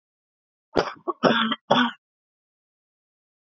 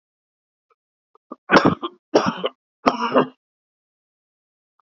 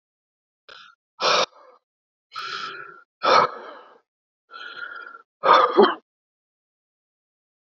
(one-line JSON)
{"cough_length": "3.6 s", "cough_amplitude": 23955, "cough_signal_mean_std_ratio": 0.33, "three_cough_length": "4.9 s", "three_cough_amplitude": 32768, "three_cough_signal_mean_std_ratio": 0.29, "exhalation_length": "7.7 s", "exhalation_amplitude": 26301, "exhalation_signal_mean_std_ratio": 0.32, "survey_phase": "beta (2021-08-13 to 2022-03-07)", "age": "45-64", "gender": "Male", "wearing_mask": "No", "symptom_cough_any": true, "symptom_runny_or_blocked_nose": true, "symptom_shortness_of_breath": true, "symptom_sore_throat": true, "symptom_fatigue": true, "symptom_onset": "5 days", "smoker_status": "Ex-smoker", "respiratory_condition_asthma": false, "respiratory_condition_other": false, "recruitment_source": "Test and Trace", "submission_delay": "2 days", "covid_test_result": "Negative", "covid_test_method": "RT-qPCR"}